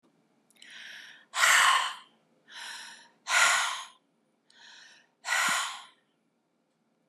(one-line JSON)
{"exhalation_length": "7.1 s", "exhalation_amplitude": 13223, "exhalation_signal_mean_std_ratio": 0.4, "survey_phase": "beta (2021-08-13 to 2022-03-07)", "age": "65+", "gender": "Female", "wearing_mask": "No", "symptom_none": true, "smoker_status": "Never smoked", "respiratory_condition_asthma": false, "respiratory_condition_other": false, "recruitment_source": "REACT", "submission_delay": "7 days", "covid_test_result": "Negative", "covid_test_method": "RT-qPCR", "influenza_a_test_result": "Unknown/Void", "influenza_b_test_result": "Unknown/Void"}